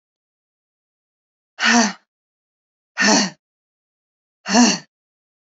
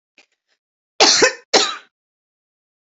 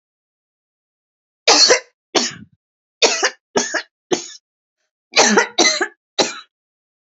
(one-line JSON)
{"exhalation_length": "5.5 s", "exhalation_amplitude": 31529, "exhalation_signal_mean_std_ratio": 0.32, "cough_length": "3.0 s", "cough_amplitude": 31150, "cough_signal_mean_std_ratio": 0.32, "three_cough_length": "7.1 s", "three_cough_amplitude": 32692, "three_cough_signal_mean_std_ratio": 0.38, "survey_phase": "beta (2021-08-13 to 2022-03-07)", "age": "45-64", "gender": "Female", "wearing_mask": "No", "symptom_cough_any": true, "symptom_runny_or_blocked_nose": true, "symptom_shortness_of_breath": true, "symptom_sore_throat": true, "symptom_diarrhoea": true, "symptom_fever_high_temperature": true, "symptom_headache": true, "symptom_change_to_sense_of_smell_or_taste": true, "symptom_loss_of_taste": true, "symptom_onset": "4 days", "smoker_status": "Current smoker (1 to 10 cigarettes per day)", "respiratory_condition_asthma": false, "respiratory_condition_other": false, "recruitment_source": "Test and Trace", "submission_delay": "1 day", "covid_test_result": "Positive", "covid_test_method": "RT-qPCR", "covid_ct_value": 17.5, "covid_ct_gene": "ORF1ab gene"}